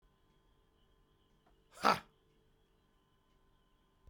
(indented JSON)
{
  "exhalation_length": "4.1 s",
  "exhalation_amplitude": 7454,
  "exhalation_signal_mean_std_ratio": 0.16,
  "survey_phase": "beta (2021-08-13 to 2022-03-07)",
  "age": "45-64",
  "gender": "Male",
  "wearing_mask": "No",
  "symptom_none": true,
  "smoker_status": "Never smoked",
  "respiratory_condition_asthma": false,
  "respiratory_condition_other": false,
  "recruitment_source": "REACT",
  "submission_delay": "2 days",
  "covid_test_result": "Negative",
  "covid_test_method": "RT-qPCR",
  "influenza_a_test_result": "Negative",
  "influenza_b_test_result": "Negative"
}